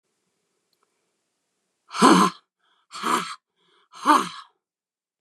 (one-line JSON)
{"exhalation_length": "5.2 s", "exhalation_amplitude": 28978, "exhalation_signal_mean_std_ratio": 0.3, "survey_phase": "beta (2021-08-13 to 2022-03-07)", "age": "18-44", "gender": "Female", "wearing_mask": "No", "symptom_new_continuous_cough": true, "symptom_runny_or_blocked_nose": true, "symptom_sore_throat": true, "symptom_fatigue": true, "symptom_headache": true, "symptom_onset": "2 days", "smoker_status": "Ex-smoker", "respiratory_condition_asthma": false, "respiratory_condition_other": false, "recruitment_source": "Test and Trace", "submission_delay": "1 day", "covid_test_result": "Positive", "covid_test_method": "RT-qPCR", "covid_ct_value": 25.0, "covid_ct_gene": "ORF1ab gene"}